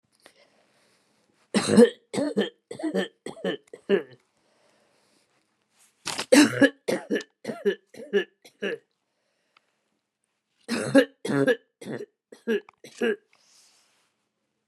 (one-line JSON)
{"three_cough_length": "14.7 s", "three_cough_amplitude": 22606, "three_cough_signal_mean_std_ratio": 0.32, "survey_phase": "beta (2021-08-13 to 2022-03-07)", "age": "65+", "gender": "Female", "wearing_mask": "No", "symptom_none": true, "smoker_status": "Never smoked", "respiratory_condition_asthma": false, "respiratory_condition_other": false, "recruitment_source": "REACT", "submission_delay": "2 days", "covid_test_result": "Negative", "covid_test_method": "RT-qPCR", "influenza_a_test_result": "Unknown/Void", "influenza_b_test_result": "Unknown/Void"}